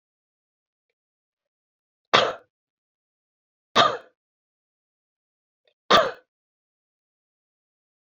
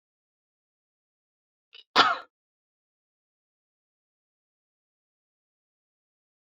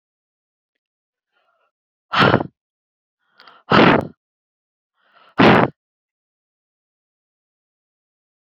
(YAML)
three_cough_length: 8.1 s
three_cough_amplitude: 28295
three_cough_signal_mean_std_ratio: 0.19
cough_length: 6.6 s
cough_amplitude: 19656
cough_signal_mean_std_ratio: 0.13
exhalation_length: 8.4 s
exhalation_amplitude: 30088
exhalation_signal_mean_std_ratio: 0.25
survey_phase: beta (2021-08-13 to 2022-03-07)
age: 45-64
gender: Female
wearing_mask: 'No'
symptom_none: true
smoker_status: Never smoked
respiratory_condition_asthma: false
respiratory_condition_other: false
recruitment_source: REACT
submission_delay: 2 days
covid_test_result: Negative
covid_test_method: RT-qPCR